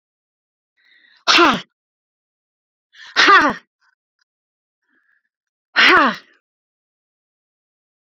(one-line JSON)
{"exhalation_length": "8.1 s", "exhalation_amplitude": 31115, "exhalation_signal_mean_std_ratio": 0.29, "survey_phase": "beta (2021-08-13 to 2022-03-07)", "age": "65+", "gender": "Female", "wearing_mask": "No", "symptom_none": true, "smoker_status": "Ex-smoker", "respiratory_condition_asthma": true, "respiratory_condition_other": false, "recruitment_source": "REACT", "submission_delay": "2 days", "covid_test_result": "Negative", "covid_test_method": "RT-qPCR"}